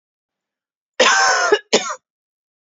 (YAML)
cough_length: 2.6 s
cough_amplitude: 29338
cough_signal_mean_std_ratio: 0.44
survey_phase: beta (2021-08-13 to 2022-03-07)
age: 18-44
gender: Female
wearing_mask: 'No'
symptom_runny_or_blocked_nose: true
symptom_sore_throat: true
symptom_onset: 3 days
smoker_status: Ex-smoker
respiratory_condition_asthma: false
respiratory_condition_other: false
recruitment_source: REACT
submission_delay: 0 days
covid_test_result: Negative
covid_test_method: RT-qPCR
influenza_a_test_result: Negative
influenza_b_test_result: Negative